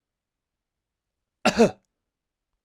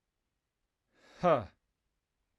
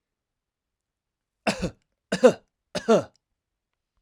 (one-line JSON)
{"cough_length": "2.6 s", "cough_amplitude": 17015, "cough_signal_mean_std_ratio": 0.21, "exhalation_length": "2.4 s", "exhalation_amplitude": 5318, "exhalation_signal_mean_std_ratio": 0.23, "three_cough_length": "4.0 s", "three_cough_amplitude": 22761, "three_cough_signal_mean_std_ratio": 0.25, "survey_phase": "alpha (2021-03-01 to 2021-08-12)", "age": "18-44", "gender": "Male", "wearing_mask": "No", "symptom_none": true, "symptom_onset": "2 days", "smoker_status": "Never smoked", "respiratory_condition_asthma": false, "respiratory_condition_other": false, "recruitment_source": "REACT", "submission_delay": "3 days", "covid_test_result": "Negative", "covid_test_method": "RT-qPCR"}